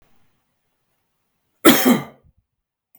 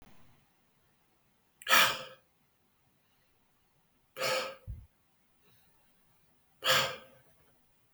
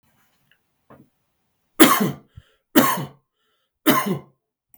{"cough_length": "3.0 s", "cough_amplitude": 32768, "cough_signal_mean_std_ratio": 0.26, "exhalation_length": "7.9 s", "exhalation_amplitude": 9953, "exhalation_signal_mean_std_ratio": 0.27, "three_cough_length": "4.8 s", "three_cough_amplitude": 32768, "three_cough_signal_mean_std_ratio": 0.31, "survey_phase": "beta (2021-08-13 to 2022-03-07)", "age": "18-44", "gender": "Male", "wearing_mask": "No", "symptom_none": true, "smoker_status": "Never smoked", "respiratory_condition_asthma": false, "respiratory_condition_other": false, "recruitment_source": "REACT", "submission_delay": "1 day", "covid_test_result": "Negative", "covid_test_method": "RT-qPCR"}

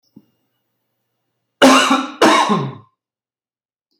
{"cough_length": "4.0 s", "cough_amplitude": 32768, "cough_signal_mean_std_ratio": 0.38, "survey_phase": "beta (2021-08-13 to 2022-03-07)", "age": "45-64", "gender": "Male", "wearing_mask": "No", "symptom_none": true, "smoker_status": "Never smoked", "respiratory_condition_asthma": false, "respiratory_condition_other": false, "recruitment_source": "REACT", "submission_delay": "0 days", "covid_test_result": "Negative", "covid_test_method": "RT-qPCR", "influenza_a_test_result": "Negative", "influenza_b_test_result": "Negative"}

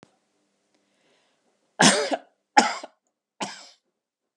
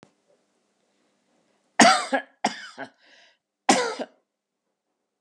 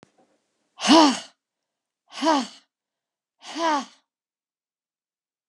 {"three_cough_length": "4.4 s", "three_cough_amplitude": 30331, "three_cough_signal_mean_std_ratio": 0.26, "cough_length": "5.2 s", "cough_amplitude": 28803, "cough_signal_mean_std_ratio": 0.27, "exhalation_length": "5.5 s", "exhalation_amplitude": 25203, "exhalation_signal_mean_std_ratio": 0.31, "survey_phase": "beta (2021-08-13 to 2022-03-07)", "age": "65+", "gender": "Female", "wearing_mask": "No", "symptom_none": true, "smoker_status": "Ex-smoker", "respiratory_condition_asthma": false, "respiratory_condition_other": false, "recruitment_source": "REACT", "submission_delay": "2 days", "covid_test_result": "Negative", "covid_test_method": "RT-qPCR"}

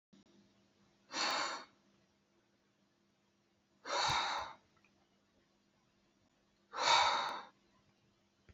{"exhalation_length": "8.5 s", "exhalation_amplitude": 4580, "exhalation_signal_mean_std_ratio": 0.36, "survey_phase": "beta (2021-08-13 to 2022-03-07)", "age": "18-44", "gender": "Male", "wearing_mask": "No", "symptom_none": true, "smoker_status": "Never smoked", "respiratory_condition_asthma": false, "respiratory_condition_other": false, "recruitment_source": "REACT", "submission_delay": "1 day", "covid_test_result": "Negative", "covid_test_method": "RT-qPCR", "influenza_a_test_result": "Negative", "influenza_b_test_result": "Negative"}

